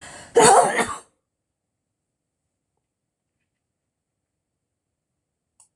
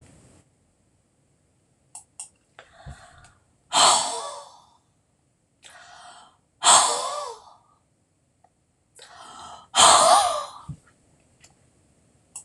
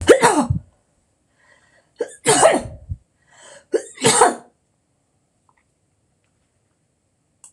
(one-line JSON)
{"cough_length": "5.8 s", "cough_amplitude": 26027, "cough_signal_mean_std_ratio": 0.23, "exhalation_length": "12.4 s", "exhalation_amplitude": 25911, "exhalation_signal_mean_std_ratio": 0.3, "three_cough_length": "7.5 s", "three_cough_amplitude": 26028, "three_cough_signal_mean_std_ratio": 0.32, "survey_phase": "beta (2021-08-13 to 2022-03-07)", "age": "45-64", "gender": "Female", "wearing_mask": "No", "symptom_none": true, "smoker_status": "Never smoked", "respiratory_condition_asthma": true, "respiratory_condition_other": false, "recruitment_source": "REACT", "submission_delay": "1 day", "covid_test_result": "Negative", "covid_test_method": "RT-qPCR"}